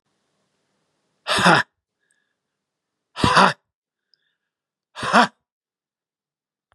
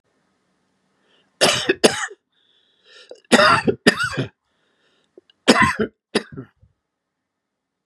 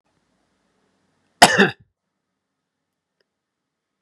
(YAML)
exhalation_length: 6.7 s
exhalation_amplitude: 31875
exhalation_signal_mean_std_ratio: 0.27
three_cough_length: 7.9 s
three_cough_amplitude: 32768
three_cough_signal_mean_std_ratio: 0.33
cough_length: 4.0 s
cough_amplitude: 32768
cough_signal_mean_std_ratio: 0.18
survey_phase: beta (2021-08-13 to 2022-03-07)
age: 65+
gender: Male
wearing_mask: 'No'
symptom_cough_any: true
smoker_status: Ex-smoker
respiratory_condition_asthma: false
respiratory_condition_other: false
recruitment_source: Test and Trace
submission_delay: 1 day
covid_test_result: Positive
covid_test_method: RT-qPCR
covid_ct_value: 20.3
covid_ct_gene: ORF1ab gene
covid_ct_mean: 20.9
covid_viral_load: 140000 copies/ml
covid_viral_load_category: Low viral load (10K-1M copies/ml)